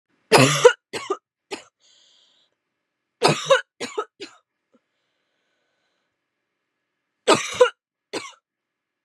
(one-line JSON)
{"three_cough_length": "9.0 s", "three_cough_amplitude": 32767, "three_cough_signal_mean_std_ratio": 0.26, "survey_phase": "beta (2021-08-13 to 2022-03-07)", "age": "18-44", "gender": "Female", "wearing_mask": "No", "symptom_cough_any": true, "symptom_runny_or_blocked_nose": true, "symptom_shortness_of_breath": true, "symptom_sore_throat": true, "symptom_abdominal_pain": true, "symptom_diarrhoea": true, "symptom_fatigue": true, "symptom_headache": true, "smoker_status": "Never smoked", "respiratory_condition_asthma": true, "respiratory_condition_other": false, "recruitment_source": "Test and Trace", "submission_delay": "2 days", "covid_test_result": "Positive", "covid_test_method": "RT-qPCR", "covid_ct_value": 25.7, "covid_ct_gene": "N gene"}